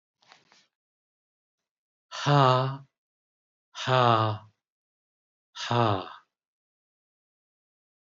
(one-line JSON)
{"exhalation_length": "8.2 s", "exhalation_amplitude": 13332, "exhalation_signal_mean_std_ratio": 0.32, "survey_phase": "beta (2021-08-13 to 2022-03-07)", "age": "65+", "gender": "Male", "wearing_mask": "No", "symptom_none": true, "symptom_onset": "2 days", "smoker_status": "Never smoked", "respiratory_condition_asthma": false, "respiratory_condition_other": false, "recruitment_source": "REACT", "submission_delay": "1 day", "covid_test_result": "Negative", "covid_test_method": "RT-qPCR"}